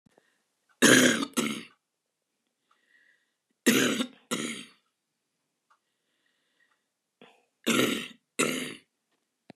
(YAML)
three_cough_length: 9.6 s
three_cough_amplitude: 21932
three_cough_signal_mean_std_ratio: 0.32
survey_phase: beta (2021-08-13 to 2022-03-07)
age: 65+
gender: Female
wearing_mask: 'No'
symptom_none: true
smoker_status: Ex-smoker
respiratory_condition_asthma: false
respiratory_condition_other: false
recruitment_source: REACT
submission_delay: 5 days
covid_test_result: Negative
covid_test_method: RT-qPCR
influenza_a_test_result: Negative
influenza_b_test_result: Negative